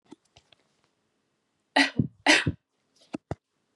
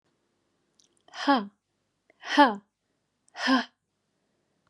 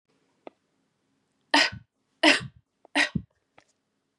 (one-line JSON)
{"cough_length": "3.8 s", "cough_amplitude": 18454, "cough_signal_mean_std_ratio": 0.26, "exhalation_length": "4.7 s", "exhalation_amplitude": 16986, "exhalation_signal_mean_std_ratio": 0.28, "three_cough_length": "4.2 s", "three_cough_amplitude": 22823, "three_cough_signal_mean_std_ratio": 0.26, "survey_phase": "beta (2021-08-13 to 2022-03-07)", "age": "18-44", "gender": "Female", "wearing_mask": "No", "symptom_none": true, "symptom_onset": "12 days", "smoker_status": "Ex-smoker", "respiratory_condition_asthma": false, "respiratory_condition_other": false, "recruitment_source": "REACT", "submission_delay": "0 days", "covid_test_result": "Negative", "covid_test_method": "RT-qPCR", "influenza_a_test_result": "Negative", "influenza_b_test_result": "Negative"}